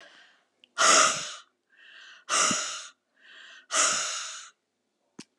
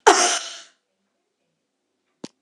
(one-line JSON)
{"exhalation_length": "5.4 s", "exhalation_amplitude": 14440, "exhalation_signal_mean_std_ratio": 0.42, "cough_length": "2.4 s", "cough_amplitude": 32767, "cough_signal_mean_std_ratio": 0.28, "survey_phase": "beta (2021-08-13 to 2022-03-07)", "age": "65+", "gender": "Female", "wearing_mask": "No", "symptom_none": true, "smoker_status": "Never smoked", "respiratory_condition_asthma": false, "respiratory_condition_other": false, "recruitment_source": "REACT", "submission_delay": "3 days", "covid_test_result": "Negative", "covid_test_method": "RT-qPCR"}